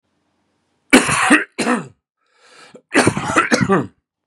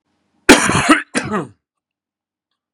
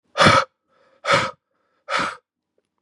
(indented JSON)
{
  "three_cough_length": "4.3 s",
  "three_cough_amplitude": 32768,
  "three_cough_signal_mean_std_ratio": 0.46,
  "cough_length": "2.7 s",
  "cough_amplitude": 32768,
  "cough_signal_mean_std_ratio": 0.36,
  "exhalation_length": "2.8 s",
  "exhalation_amplitude": 30698,
  "exhalation_signal_mean_std_ratio": 0.38,
  "survey_phase": "beta (2021-08-13 to 2022-03-07)",
  "age": "18-44",
  "gender": "Male",
  "wearing_mask": "No",
  "symptom_cough_any": true,
  "symptom_onset": "6 days",
  "smoker_status": "Never smoked",
  "respiratory_condition_asthma": true,
  "respiratory_condition_other": false,
  "recruitment_source": "REACT",
  "submission_delay": "2 days",
  "covid_test_result": "Negative",
  "covid_test_method": "RT-qPCR",
  "influenza_a_test_result": "Negative",
  "influenza_b_test_result": "Negative"
}